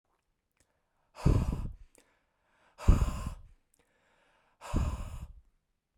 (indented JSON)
{
  "exhalation_length": "6.0 s",
  "exhalation_amplitude": 11508,
  "exhalation_signal_mean_std_ratio": 0.33,
  "survey_phase": "beta (2021-08-13 to 2022-03-07)",
  "age": "18-44",
  "gender": "Male",
  "wearing_mask": "No",
  "symptom_none": true,
  "smoker_status": "Never smoked",
  "respiratory_condition_asthma": false,
  "respiratory_condition_other": false,
  "recruitment_source": "REACT",
  "submission_delay": "1 day",
  "covid_test_result": "Negative",
  "covid_test_method": "RT-qPCR",
  "influenza_a_test_result": "Negative",
  "influenza_b_test_result": "Negative"
}